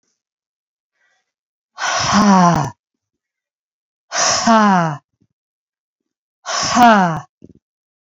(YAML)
exhalation_length: 8.0 s
exhalation_amplitude: 30376
exhalation_signal_mean_std_ratio: 0.43
survey_phase: beta (2021-08-13 to 2022-03-07)
age: 45-64
gender: Female
wearing_mask: 'No'
symptom_none: true
smoker_status: Never smoked
respiratory_condition_asthma: false
respiratory_condition_other: false
recruitment_source: REACT
submission_delay: 2 days
covid_test_result: Negative
covid_test_method: RT-qPCR
influenza_a_test_result: Unknown/Void
influenza_b_test_result: Unknown/Void